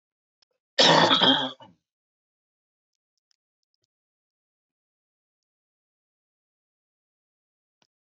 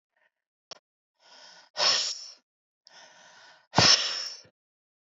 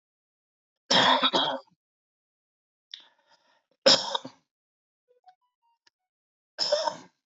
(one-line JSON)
{"cough_length": "8.0 s", "cough_amplitude": 19634, "cough_signal_mean_std_ratio": 0.23, "exhalation_length": "5.1 s", "exhalation_amplitude": 16090, "exhalation_signal_mean_std_ratio": 0.31, "three_cough_length": "7.3 s", "three_cough_amplitude": 16411, "three_cough_signal_mean_std_ratio": 0.3, "survey_phase": "alpha (2021-03-01 to 2021-08-12)", "age": "45-64", "gender": "Male", "wearing_mask": "No", "symptom_new_continuous_cough": true, "symptom_diarrhoea": true, "symptom_fatigue": true, "symptom_fever_high_temperature": true, "symptom_loss_of_taste": true, "symptom_onset": "4 days", "smoker_status": "Never smoked", "respiratory_condition_asthma": false, "respiratory_condition_other": false, "recruitment_source": "Test and Trace", "submission_delay": "2 days", "covid_test_result": "Positive", "covid_test_method": "RT-qPCR", "covid_ct_value": 12.9, "covid_ct_gene": "ORF1ab gene", "covid_ct_mean": 13.4, "covid_viral_load": "39000000 copies/ml", "covid_viral_load_category": "High viral load (>1M copies/ml)"}